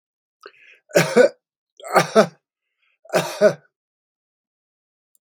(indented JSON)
{
  "three_cough_length": "5.2 s",
  "three_cough_amplitude": 32767,
  "three_cough_signal_mean_std_ratio": 0.3,
  "survey_phase": "beta (2021-08-13 to 2022-03-07)",
  "age": "65+",
  "gender": "Male",
  "wearing_mask": "No",
  "symptom_cough_any": true,
  "smoker_status": "Current smoker (1 to 10 cigarettes per day)",
  "respiratory_condition_asthma": false,
  "respiratory_condition_other": false,
  "recruitment_source": "REACT",
  "submission_delay": "2 days",
  "covid_test_result": "Negative",
  "covid_test_method": "RT-qPCR",
  "influenza_a_test_result": "Unknown/Void",
  "influenza_b_test_result": "Unknown/Void"
}